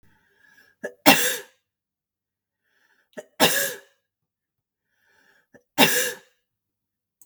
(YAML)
three_cough_length: 7.3 s
three_cough_amplitude: 32768
three_cough_signal_mean_std_ratio: 0.27
survey_phase: beta (2021-08-13 to 2022-03-07)
age: 45-64
gender: Female
wearing_mask: 'No'
symptom_none: true
symptom_onset: 7 days
smoker_status: Never smoked
respiratory_condition_asthma: false
respiratory_condition_other: false
recruitment_source: REACT
submission_delay: 3 days
covid_test_result: Negative
covid_test_method: RT-qPCR
influenza_a_test_result: Negative
influenza_b_test_result: Negative